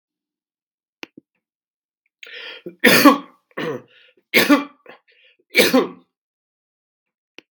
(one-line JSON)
{"three_cough_length": "7.5 s", "three_cough_amplitude": 32768, "three_cough_signal_mean_std_ratio": 0.29, "survey_phase": "beta (2021-08-13 to 2022-03-07)", "age": "65+", "gender": "Male", "wearing_mask": "No", "symptom_cough_any": true, "smoker_status": "Ex-smoker", "respiratory_condition_asthma": false, "respiratory_condition_other": false, "recruitment_source": "REACT", "submission_delay": "1 day", "covid_test_result": "Negative", "covid_test_method": "RT-qPCR", "influenza_a_test_result": "Negative", "influenza_b_test_result": "Negative"}